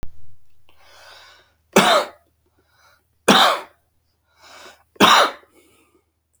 {"three_cough_length": "6.4 s", "three_cough_amplitude": 30228, "three_cough_signal_mean_std_ratio": 0.34, "survey_phase": "beta (2021-08-13 to 2022-03-07)", "age": "45-64", "gender": "Male", "wearing_mask": "No", "symptom_cough_any": true, "symptom_runny_or_blocked_nose": true, "symptom_fatigue": true, "symptom_fever_high_temperature": true, "symptom_headache": true, "smoker_status": "Never smoked", "respiratory_condition_asthma": false, "respiratory_condition_other": false, "recruitment_source": "Test and Trace", "submission_delay": "2 days", "covid_test_result": "Positive", "covid_test_method": "LFT"}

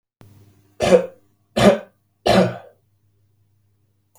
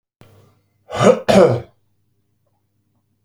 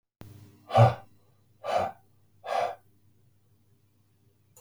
{"three_cough_length": "4.2 s", "three_cough_amplitude": 32768, "three_cough_signal_mean_std_ratio": 0.32, "cough_length": "3.2 s", "cough_amplitude": 32768, "cough_signal_mean_std_ratio": 0.32, "exhalation_length": "4.6 s", "exhalation_amplitude": 14533, "exhalation_signal_mean_std_ratio": 0.29, "survey_phase": "beta (2021-08-13 to 2022-03-07)", "age": "18-44", "gender": "Male", "wearing_mask": "No", "symptom_other": true, "smoker_status": "Ex-smoker", "respiratory_condition_asthma": false, "respiratory_condition_other": false, "recruitment_source": "REACT", "submission_delay": "3 days", "covid_test_result": "Negative", "covid_test_method": "RT-qPCR", "influenza_a_test_result": "Negative", "influenza_b_test_result": "Negative"}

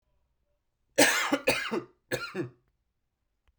{"three_cough_length": "3.6 s", "three_cough_amplitude": 19358, "three_cough_signal_mean_std_ratio": 0.38, "survey_phase": "beta (2021-08-13 to 2022-03-07)", "age": "45-64", "gender": "Male", "wearing_mask": "No", "symptom_cough_any": true, "symptom_runny_or_blocked_nose": true, "symptom_sore_throat": true, "symptom_fatigue": true, "symptom_headache": true, "smoker_status": "Prefer not to say", "respiratory_condition_asthma": false, "respiratory_condition_other": false, "recruitment_source": "Test and Trace", "submission_delay": "2 days", "covid_test_result": "Positive", "covid_test_method": "RT-qPCR", "covid_ct_value": 22.7, "covid_ct_gene": "ORF1ab gene", "covid_ct_mean": 23.4, "covid_viral_load": "21000 copies/ml", "covid_viral_load_category": "Low viral load (10K-1M copies/ml)"}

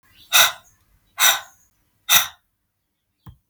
{"exhalation_length": "3.5 s", "exhalation_amplitude": 32768, "exhalation_signal_mean_std_ratio": 0.31, "survey_phase": "beta (2021-08-13 to 2022-03-07)", "age": "18-44", "gender": "Female", "wearing_mask": "No", "symptom_none": true, "symptom_onset": "6 days", "smoker_status": "Ex-smoker", "respiratory_condition_asthma": false, "respiratory_condition_other": false, "recruitment_source": "REACT", "submission_delay": "2 days", "covid_test_result": "Negative", "covid_test_method": "RT-qPCR", "influenza_a_test_result": "Negative", "influenza_b_test_result": "Negative"}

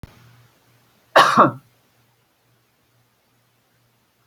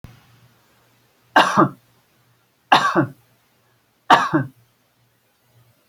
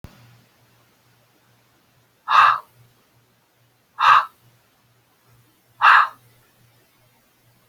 {"cough_length": "4.3 s", "cough_amplitude": 29593, "cough_signal_mean_std_ratio": 0.23, "three_cough_length": "5.9 s", "three_cough_amplitude": 31119, "three_cough_signal_mean_std_ratio": 0.3, "exhalation_length": "7.7 s", "exhalation_amplitude": 28627, "exhalation_signal_mean_std_ratio": 0.26, "survey_phase": "alpha (2021-03-01 to 2021-08-12)", "age": "65+", "gender": "Female", "wearing_mask": "No", "symptom_none": true, "symptom_onset": "12 days", "smoker_status": "Ex-smoker", "respiratory_condition_asthma": false, "respiratory_condition_other": false, "recruitment_source": "REACT", "submission_delay": "3 days", "covid_test_result": "Negative", "covid_test_method": "RT-qPCR"}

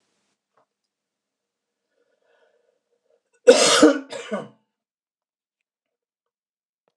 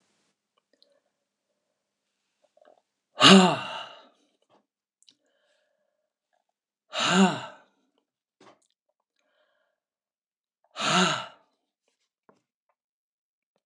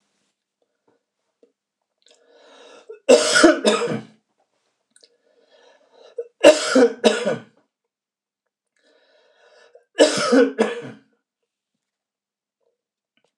{"cough_length": "7.0 s", "cough_amplitude": 26028, "cough_signal_mean_std_ratio": 0.21, "exhalation_length": "13.7 s", "exhalation_amplitude": 25989, "exhalation_signal_mean_std_ratio": 0.21, "three_cough_length": "13.4 s", "three_cough_amplitude": 26028, "three_cough_signal_mean_std_ratio": 0.3, "survey_phase": "beta (2021-08-13 to 2022-03-07)", "age": "65+", "gender": "Male", "wearing_mask": "No", "symptom_none": true, "smoker_status": "Ex-smoker", "respiratory_condition_asthma": false, "respiratory_condition_other": false, "recruitment_source": "REACT", "submission_delay": "5 days", "covid_test_result": "Negative", "covid_test_method": "RT-qPCR", "influenza_a_test_result": "Negative", "influenza_b_test_result": "Negative"}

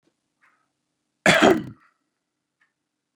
{"cough_length": "3.2 s", "cough_amplitude": 27254, "cough_signal_mean_std_ratio": 0.25, "survey_phase": "beta (2021-08-13 to 2022-03-07)", "age": "45-64", "gender": "Male", "wearing_mask": "No", "symptom_none": true, "smoker_status": "Ex-smoker", "respiratory_condition_asthma": false, "respiratory_condition_other": false, "recruitment_source": "REACT", "submission_delay": "2 days", "covid_test_result": "Negative", "covid_test_method": "RT-qPCR", "influenza_a_test_result": "Negative", "influenza_b_test_result": "Negative"}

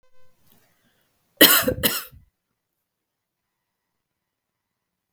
{"cough_length": "5.1 s", "cough_amplitude": 32768, "cough_signal_mean_std_ratio": 0.22, "survey_phase": "beta (2021-08-13 to 2022-03-07)", "age": "18-44", "gender": "Female", "wearing_mask": "No", "symptom_runny_or_blocked_nose": true, "symptom_sore_throat": true, "smoker_status": "Never smoked", "respiratory_condition_asthma": false, "respiratory_condition_other": false, "recruitment_source": "REACT", "submission_delay": "2 days", "covid_test_result": "Negative", "covid_test_method": "RT-qPCR", "influenza_a_test_result": "Negative", "influenza_b_test_result": "Negative"}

